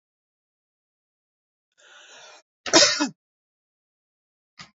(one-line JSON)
{"cough_length": "4.8 s", "cough_amplitude": 32768, "cough_signal_mean_std_ratio": 0.21, "survey_phase": "beta (2021-08-13 to 2022-03-07)", "age": "45-64", "gender": "Female", "wearing_mask": "Yes", "symptom_none": true, "smoker_status": "Never smoked", "respiratory_condition_asthma": false, "respiratory_condition_other": false, "recruitment_source": "REACT", "submission_delay": "2 days", "covid_test_result": "Negative", "covid_test_method": "RT-qPCR", "influenza_a_test_result": "Negative", "influenza_b_test_result": "Negative"}